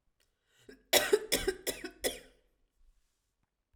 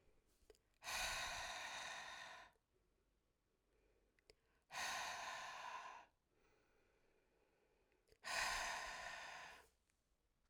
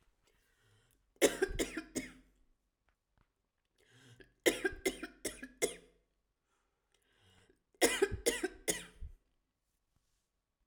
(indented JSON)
{
  "cough_length": "3.8 s",
  "cough_amplitude": 9622,
  "cough_signal_mean_std_ratio": 0.31,
  "exhalation_length": "10.5 s",
  "exhalation_amplitude": 962,
  "exhalation_signal_mean_std_ratio": 0.54,
  "three_cough_length": "10.7 s",
  "three_cough_amplitude": 7553,
  "three_cough_signal_mean_std_ratio": 0.29,
  "survey_phase": "alpha (2021-03-01 to 2021-08-12)",
  "age": "18-44",
  "gender": "Female",
  "wearing_mask": "No",
  "symptom_none": true,
  "smoker_status": "Never smoked",
  "respiratory_condition_asthma": false,
  "respiratory_condition_other": false,
  "recruitment_source": "REACT",
  "submission_delay": "3 days",
  "covid_test_result": "Negative",
  "covid_test_method": "RT-qPCR"
}